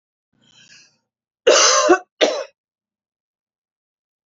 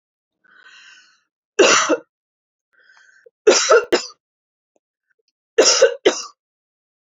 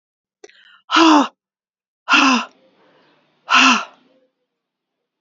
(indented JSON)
{
  "cough_length": "4.3 s",
  "cough_amplitude": 32768,
  "cough_signal_mean_std_ratio": 0.32,
  "three_cough_length": "7.1 s",
  "three_cough_amplitude": 31629,
  "three_cough_signal_mean_std_ratio": 0.33,
  "exhalation_length": "5.2 s",
  "exhalation_amplitude": 30202,
  "exhalation_signal_mean_std_ratio": 0.37,
  "survey_phase": "alpha (2021-03-01 to 2021-08-12)",
  "age": "45-64",
  "gender": "Female",
  "wearing_mask": "No",
  "symptom_fatigue": true,
  "symptom_headache": true,
  "smoker_status": "Ex-smoker",
  "respiratory_condition_asthma": false,
  "respiratory_condition_other": false,
  "recruitment_source": "Test and Trace",
  "submission_delay": "2 days",
  "covid_test_result": "Positive",
  "covid_test_method": "RT-qPCR",
  "covid_ct_value": 18.1,
  "covid_ct_gene": "ORF1ab gene",
  "covid_ct_mean": 18.4,
  "covid_viral_load": "900000 copies/ml",
  "covid_viral_load_category": "Low viral load (10K-1M copies/ml)"
}